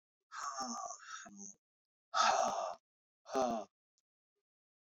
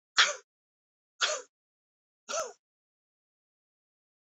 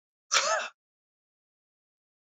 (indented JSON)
{
  "exhalation_length": "4.9 s",
  "exhalation_amplitude": 3800,
  "exhalation_signal_mean_std_ratio": 0.44,
  "three_cough_length": "4.3 s",
  "three_cough_amplitude": 13052,
  "three_cough_signal_mean_std_ratio": 0.24,
  "cough_length": "2.3 s",
  "cough_amplitude": 10481,
  "cough_signal_mean_std_ratio": 0.3,
  "survey_phase": "beta (2021-08-13 to 2022-03-07)",
  "age": "65+",
  "gender": "Male",
  "wearing_mask": "No",
  "symptom_none": true,
  "smoker_status": "Never smoked",
  "respiratory_condition_asthma": false,
  "respiratory_condition_other": false,
  "recruitment_source": "REACT",
  "submission_delay": "2 days",
  "covid_test_result": "Negative",
  "covid_test_method": "RT-qPCR",
  "influenza_a_test_result": "Negative",
  "influenza_b_test_result": "Negative"
}